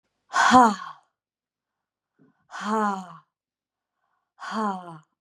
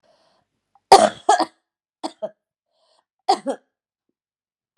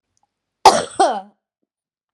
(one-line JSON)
{"exhalation_length": "5.2 s", "exhalation_amplitude": 28208, "exhalation_signal_mean_std_ratio": 0.32, "three_cough_length": "4.8 s", "three_cough_amplitude": 32768, "three_cough_signal_mean_std_ratio": 0.23, "cough_length": "2.1 s", "cough_amplitude": 32768, "cough_signal_mean_std_ratio": 0.29, "survey_phase": "beta (2021-08-13 to 2022-03-07)", "age": "45-64", "gender": "Female", "wearing_mask": "No", "symptom_cough_any": true, "symptom_new_continuous_cough": true, "symptom_runny_or_blocked_nose": true, "symptom_shortness_of_breath": true, "symptom_sore_throat": true, "symptom_diarrhoea": true, "symptom_fever_high_temperature": true, "symptom_headache": true, "smoker_status": "Never smoked", "respiratory_condition_asthma": false, "respiratory_condition_other": false, "recruitment_source": "Test and Trace", "submission_delay": "1 day", "covid_test_result": "Positive", "covid_test_method": "LFT"}